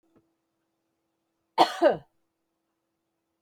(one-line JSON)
{"cough_length": "3.4 s", "cough_amplitude": 15591, "cough_signal_mean_std_ratio": 0.21, "survey_phase": "beta (2021-08-13 to 2022-03-07)", "age": "45-64", "gender": "Female", "wearing_mask": "No", "symptom_none": true, "smoker_status": "Never smoked", "respiratory_condition_asthma": false, "respiratory_condition_other": false, "recruitment_source": "REACT", "submission_delay": "2 days", "covid_test_result": "Negative", "covid_test_method": "RT-qPCR"}